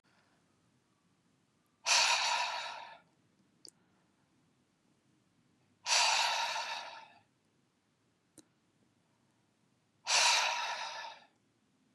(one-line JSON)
{"exhalation_length": "11.9 s", "exhalation_amplitude": 6159, "exhalation_signal_mean_std_ratio": 0.38, "survey_phase": "beta (2021-08-13 to 2022-03-07)", "age": "45-64", "gender": "Male", "wearing_mask": "No", "symptom_none": true, "smoker_status": "Never smoked", "respiratory_condition_asthma": false, "respiratory_condition_other": false, "recruitment_source": "REACT", "submission_delay": "0 days", "covid_test_result": "Negative", "covid_test_method": "RT-qPCR"}